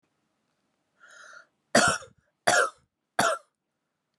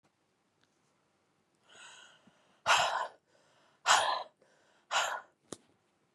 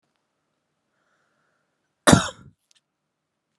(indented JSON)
{
  "three_cough_length": "4.2 s",
  "three_cough_amplitude": 19727,
  "three_cough_signal_mean_std_ratio": 0.31,
  "exhalation_length": "6.1 s",
  "exhalation_amplitude": 9480,
  "exhalation_signal_mean_std_ratio": 0.32,
  "cough_length": "3.6 s",
  "cough_amplitude": 32329,
  "cough_signal_mean_std_ratio": 0.16,
  "survey_phase": "beta (2021-08-13 to 2022-03-07)",
  "age": "18-44",
  "gender": "Female",
  "wearing_mask": "No",
  "symptom_cough_any": true,
  "symptom_runny_or_blocked_nose": true,
  "symptom_shortness_of_breath": true,
  "symptom_fatigue": true,
  "symptom_other": true,
  "smoker_status": "Never smoked",
  "respiratory_condition_asthma": false,
  "respiratory_condition_other": false,
  "recruitment_source": "Test and Trace",
  "submission_delay": "2 days",
  "covid_test_result": "Positive",
  "covid_test_method": "RT-qPCR",
  "covid_ct_value": 17.8,
  "covid_ct_gene": "ORF1ab gene",
  "covid_ct_mean": 19.1,
  "covid_viral_load": "540000 copies/ml",
  "covid_viral_load_category": "Low viral load (10K-1M copies/ml)"
}